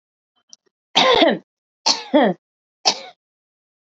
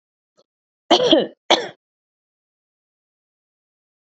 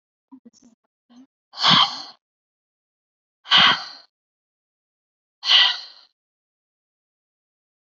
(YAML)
three_cough_length: 3.9 s
three_cough_amplitude: 32767
three_cough_signal_mean_std_ratio: 0.37
cough_length: 4.1 s
cough_amplitude: 27885
cough_signal_mean_std_ratio: 0.26
exhalation_length: 7.9 s
exhalation_amplitude: 27316
exhalation_signal_mean_std_ratio: 0.27
survey_phase: beta (2021-08-13 to 2022-03-07)
age: 18-44
gender: Female
wearing_mask: 'No'
symptom_cough_any: true
symptom_new_continuous_cough: true
symptom_sore_throat: true
symptom_fatigue: true
symptom_headache: true
symptom_change_to_sense_of_smell_or_taste: true
symptom_loss_of_taste: true
symptom_onset: 4 days
smoker_status: Current smoker (e-cigarettes or vapes only)
respiratory_condition_asthma: false
respiratory_condition_other: false
recruitment_source: Test and Trace
submission_delay: 1 day
covid_test_result: Positive
covid_test_method: RT-qPCR
covid_ct_value: 16.6
covid_ct_gene: ORF1ab gene
covid_ct_mean: 16.8
covid_viral_load: 3000000 copies/ml
covid_viral_load_category: High viral load (>1M copies/ml)